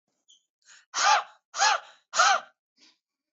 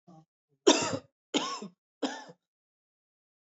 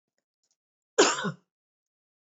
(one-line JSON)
{"exhalation_length": "3.3 s", "exhalation_amplitude": 12754, "exhalation_signal_mean_std_ratio": 0.39, "three_cough_length": "3.5 s", "three_cough_amplitude": 15168, "three_cough_signal_mean_std_ratio": 0.29, "cough_length": "2.4 s", "cough_amplitude": 15521, "cough_signal_mean_std_ratio": 0.25, "survey_phase": "beta (2021-08-13 to 2022-03-07)", "age": "18-44", "gender": "Female", "wearing_mask": "No", "symptom_none": true, "smoker_status": "Ex-smoker", "respiratory_condition_asthma": false, "respiratory_condition_other": false, "recruitment_source": "REACT", "submission_delay": "2 days", "covid_test_result": "Negative", "covid_test_method": "RT-qPCR", "influenza_a_test_result": "Negative", "influenza_b_test_result": "Negative"}